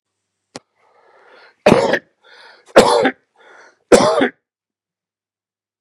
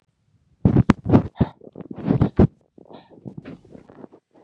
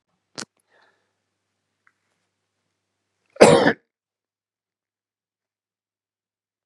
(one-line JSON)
{"three_cough_length": "5.8 s", "three_cough_amplitude": 32768, "three_cough_signal_mean_std_ratio": 0.32, "exhalation_length": "4.4 s", "exhalation_amplitude": 32768, "exhalation_signal_mean_std_ratio": 0.32, "cough_length": "6.7 s", "cough_amplitude": 32768, "cough_signal_mean_std_ratio": 0.16, "survey_phase": "beta (2021-08-13 to 2022-03-07)", "age": "45-64", "gender": "Male", "wearing_mask": "No", "symptom_fatigue": true, "symptom_change_to_sense_of_smell_or_taste": true, "symptom_onset": "12 days", "smoker_status": "Never smoked", "respiratory_condition_asthma": false, "respiratory_condition_other": false, "recruitment_source": "REACT", "submission_delay": "3 days", "covid_test_result": "Negative", "covid_test_method": "RT-qPCR", "influenza_a_test_result": "Unknown/Void", "influenza_b_test_result": "Unknown/Void"}